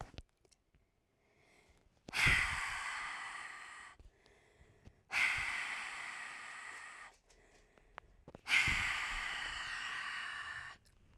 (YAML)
exhalation_length: 11.2 s
exhalation_amplitude: 4484
exhalation_signal_mean_std_ratio: 0.54
survey_phase: alpha (2021-03-01 to 2021-08-12)
age: 18-44
gender: Female
wearing_mask: 'No'
symptom_cough_any: true
symptom_new_continuous_cough: true
symptom_fatigue: true
symptom_fever_high_temperature: true
symptom_headache: true
symptom_change_to_sense_of_smell_or_taste: true
symptom_loss_of_taste: true
symptom_onset: 4 days
smoker_status: Never smoked
respiratory_condition_asthma: false
respiratory_condition_other: false
recruitment_source: Test and Trace
submission_delay: 2 days
covid_test_result: Positive
covid_test_method: RT-qPCR
covid_ct_value: 14.1
covid_ct_gene: S gene
covid_ct_mean: 14.3
covid_viral_load: 20000000 copies/ml
covid_viral_load_category: High viral load (>1M copies/ml)